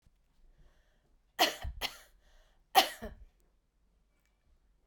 {"three_cough_length": "4.9 s", "three_cough_amplitude": 11470, "three_cough_signal_mean_std_ratio": 0.23, "survey_phase": "beta (2021-08-13 to 2022-03-07)", "age": "45-64", "gender": "Female", "wearing_mask": "No", "symptom_cough_any": true, "symptom_runny_or_blocked_nose": true, "symptom_fatigue": true, "symptom_headache": true, "symptom_onset": "4 days", "smoker_status": "Never smoked", "respiratory_condition_asthma": false, "respiratory_condition_other": false, "recruitment_source": "Test and Trace", "submission_delay": "2 days", "covid_test_result": "Positive", "covid_test_method": "RT-qPCR", "covid_ct_value": 23.1, "covid_ct_gene": "ORF1ab gene", "covid_ct_mean": 23.6, "covid_viral_load": "18000 copies/ml", "covid_viral_load_category": "Low viral load (10K-1M copies/ml)"}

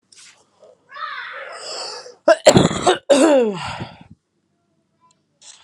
{"cough_length": "5.6 s", "cough_amplitude": 32768, "cough_signal_mean_std_ratio": 0.39, "survey_phase": "alpha (2021-03-01 to 2021-08-12)", "age": "18-44", "gender": "Female", "wearing_mask": "No", "symptom_cough_any": true, "symptom_shortness_of_breath": true, "symptom_abdominal_pain": true, "symptom_fever_high_temperature": true, "symptom_headache": true, "symptom_change_to_sense_of_smell_or_taste": true, "symptom_loss_of_taste": true, "symptom_onset": "3 days", "smoker_status": "Current smoker (11 or more cigarettes per day)", "respiratory_condition_asthma": false, "respiratory_condition_other": false, "recruitment_source": "Test and Trace", "submission_delay": "1 day", "covid_test_result": "Positive", "covid_test_method": "RT-qPCR"}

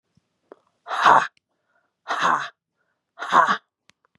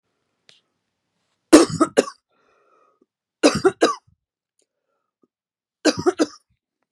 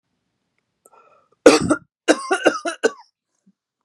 {"exhalation_length": "4.2 s", "exhalation_amplitude": 31020, "exhalation_signal_mean_std_ratio": 0.35, "three_cough_length": "6.9 s", "three_cough_amplitude": 32768, "three_cough_signal_mean_std_ratio": 0.25, "cough_length": "3.8 s", "cough_amplitude": 32768, "cough_signal_mean_std_ratio": 0.3, "survey_phase": "beta (2021-08-13 to 2022-03-07)", "age": "45-64", "gender": "Female", "wearing_mask": "No", "symptom_fatigue": true, "symptom_onset": "12 days", "smoker_status": "Never smoked", "respiratory_condition_asthma": false, "respiratory_condition_other": false, "recruitment_source": "REACT", "submission_delay": "1 day", "covid_test_result": "Positive", "covid_test_method": "RT-qPCR", "covid_ct_value": 38.4, "covid_ct_gene": "N gene", "influenza_a_test_result": "Negative", "influenza_b_test_result": "Negative"}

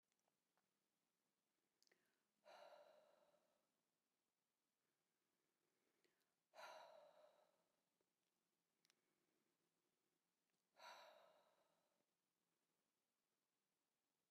{"exhalation_length": "14.3 s", "exhalation_amplitude": 115, "exhalation_signal_mean_std_ratio": 0.36, "survey_phase": "beta (2021-08-13 to 2022-03-07)", "age": "65+", "gender": "Female", "wearing_mask": "No", "symptom_none": true, "smoker_status": "Ex-smoker", "respiratory_condition_asthma": false, "respiratory_condition_other": false, "recruitment_source": "REACT", "submission_delay": "1 day", "covid_test_result": "Negative", "covid_test_method": "RT-qPCR", "influenza_a_test_result": "Negative", "influenza_b_test_result": "Negative"}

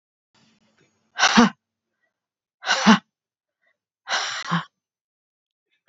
{"exhalation_length": "5.9 s", "exhalation_amplitude": 28535, "exhalation_signal_mean_std_ratio": 0.29, "survey_phase": "beta (2021-08-13 to 2022-03-07)", "age": "45-64", "gender": "Female", "wearing_mask": "No", "symptom_cough_any": true, "symptom_new_continuous_cough": true, "symptom_runny_or_blocked_nose": true, "symptom_shortness_of_breath": true, "symptom_sore_throat": true, "symptom_fatigue": true, "symptom_fever_high_temperature": true, "symptom_headache": true, "smoker_status": "Ex-smoker", "respiratory_condition_asthma": false, "respiratory_condition_other": false, "recruitment_source": "Test and Trace", "submission_delay": "1 day", "covid_test_result": "Positive", "covid_test_method": "LFT"}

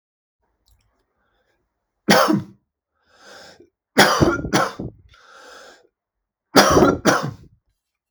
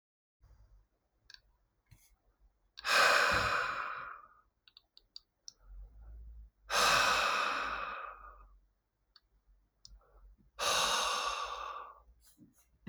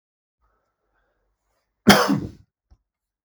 {"three_cough_length": "8.1 s", "three_cough_amplitude": 32768, "three_cough_signal_mean_std_ratio": 0.36, "exhalation_length": "12.9 s", "exhalation_amplitude": 7627, "exhalation_signal_mean_std_ratio": 0.45, "cough_length": "3.2 s", "cough_amplitude": 32766, "cough_signal_mean_std_ratio": 0.23, "survey_phase": "beta (2021-08-13 to 2022-03-07)", "age": "18-44", "gender": "Male", "wearing_mask": "No", "symptom_none": true, "smoker_status": "Never smoked", "respiratory_condition_asthma": false, "respiratory_condition_other": false, "recruitment_source": "REACT", "submission_delay": "0 days", "covid_test_result": "Negative", "covid_test_method": "RT-qPCR", "influenza_a_test_result": "Negative", "influenza_b_test_result": "Negative"}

